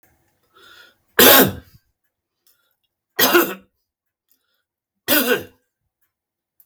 {"three_cough_length": "6.7 s", "three_cough_amplitude": 32768, "three_cough_signal_mean_std_ratio": 0.29, "survey_phase": "beta (2021-08-13 to 2022-03-07)", "age": "65+", "gender": "Male", "wearing_mask": "No", "symptom_none": true, "smoker_status": "Never smoked", "respiratory_condition_asthma": false, "respiratory_condition_other": false, "recruitment_source": "REACT", "submission_delay": "2 days", "covid_test_result": "Negative", "covid_test_method": "RT-qPCR", "influenza_a_test_result": "Negative", "influenza_b_test_result": "Negative"}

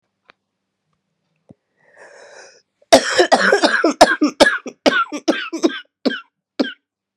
{"cough_length": "7.2 s", "cough_amplitude": 32768, "cough_signal_mean_std_ratio": 0.39, "survey_phase": "beta (2021-08-13 to 2022-03-07)", "age": "45-64", "gender": "Female", "wearing_mask": "No", "symptom_cough_any": true, "symptom_sore_throat": true, "symptom_diarrhoea": true, "symptom_fatigue": true, "symptom_headache": true, "symptom_change_to_sense_of_smell_or_taste": true, "symptom_onset": "3 days", "smoker_status": "Ex-smoker", "respiratory_condition_asthma": false, "respiratory_condition_other": false, "recruitment_source": "Test and Trace", "submission_delay": "1 day", "covid_test_result": "Positive", "covid_test_method": "RT-qPCR", "covid_ct_value": 12.9, "covid_ct_gene": "ORF1ab gene", "covid_ct_mean": 13.6, "covid_viral_load": "35000000 copies/ml", "covid_viral_load_category": "High viral load (>1M copies/ml)"}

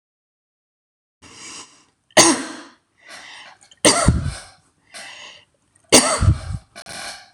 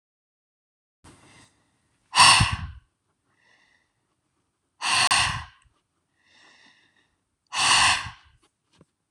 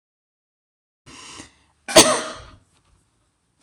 {"three_cough_length": "7.3 s", "three_cough_amplitude": 26028, "three_cough_signal_mean_std_ratio": 0.34, "exhalation_length": "9.1 s", "exhalation_amplitude": 25422, "exhalation_signal_mean_std_ratio": 0.31, "cough_length": "3.6 s", "cough_amplitude": 26028, "cough_signal_mean_std_ratio": 0.22, "survey_phase": "beta (2021-08-13 to 2022-03-07)", "age": "18-44", "gender": "Female", "wearing_mask": "No", "symptom_runny_or_blocked_nose": true, "symptom_diarrhoea": true, "symptom_fatigue": true, "symptom_headache": true, "smoker_status": "Current smoker (e-cigarettes or vapes only)", "respiratory_condition_asthma": false, "respiratory_condition_other": false, "recruitment_source": "REACT", "submission_delay": "2 days", "covid_test_result": "Negative", "covid_test_method": "RT-qPCR"}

